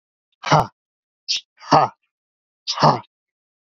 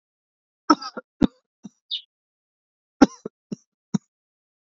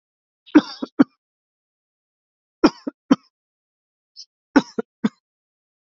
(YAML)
exhalation_length: 3.8 s
exhalation_amplitude: 30925
exhalation_signal_mean_std_ratio: 0.32
cough_length: 4.6 s
cough_amplitude: 29276
cough_signal_mean_std_ratio: 0.16
three_cough_length: 6.0 s
three_cough_amplitude: 29245
three_cough_signal_mean_std_ratio: 0.18
survey_phase: beta (2021-08-13 to 2022-03-07)
age: 18-44
gender: Male
wearing_mask: 'No'
symptom_none: true
smoker_status: Current smoker (e-cigarettes or vapes only)
respiratory_condition_asthma: false
respiratory_condition_other: false
recruitment_source: REACT
submission_delay: 1 day
covid_test_result: Negative
covid_test_method: RT-qPCR
influenza_a_test_result: Negative
influenza_b_test_result: Negative